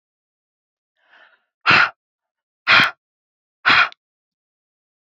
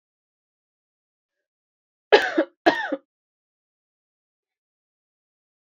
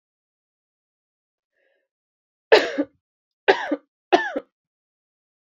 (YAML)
exhalation_length: 5.0 s
exhalation_amplitude: 31964
exhalation_signal_mean_std_ratio: 0.29
cough_length: 5.6 s
cough_amplitude: 27668
cough_signal_mean_std_ratio: 0.19
three_cough_length: 5.5 s
three_cough_amplitude: 28512
three_cough_signal_mean_std_ratio: 0.23
survey_phase: beta (2021-08-13 to 2022-03-07)
age: 18-44
gender: Female
wearing_mask: 'No'
symptom_cough_any: true
symptom_runny_or_blocked_nose: true
symptom_fatigue: true
symptom_headache: true
smoker_status: Never smoked
respiratory_condition_asthma: false
respiratory_condition_other: false
recruitment_source: Test and Trace
submission_delay: 2 days
covid_test_result: Positive
covid_test_method: LFT